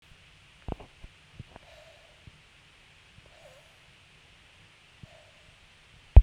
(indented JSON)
{
  "exhalation_length": "6.2 s",
  "exhalation_amplitude": 32294,
  "exhalation_signal_mean_std_ratio": 0.11,
  "survey_phase": "beta (2021-08-13 to 2022-03-07)",
  "age": "18-44",
  "gender": "Female",
  "wearing_mask": "No",
  "symptom_cough_any": true,
  "symptom_sore_throat": true,
  "symptom_onset": "5 days",
  "smoker_status": "Current smoker (1 to 10 cigarettes per day)",
  "respiratory_condition_asthma": true,
  "respiratory_condition_other": false,
  "recruitment_source": "REACT",
  "submission_delay": "1 day",
  "covid_test_result": "Negative",
  "covid_test_method": "RT-qPCR"
}